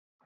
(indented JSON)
{
  "three_cough_length": "0.3 s",
  "three_cough_amplitude": 57,
  "three_cough_signal_mean_std_ratio": 0.39,
  "survey_phase": "beta (2021-08-13 to 2022-03-07)",
  "age": "18-44",
  "gender": "Female",
  "wearing_mask": "No",
  "symptom_cough_any": true,
  "symptom_abdominal_pain": true,
  "symptom_onset": "12 days",
  "smoker_status": "Never smoked",
  "respiratory_condition_asthma": false,
  "respiratory_condition_other": false,
  "recruitment_source": "REACT",
  "submission_delay": "1 day",
  "covid_test_result": "Negative",
  "covid_test_method": "RT-qPCR",
  "influenza_a_test_result": "Positive",
  "influenza_a_ct_value": 31.5,
  "influenza_b_test_result": "Negative"
}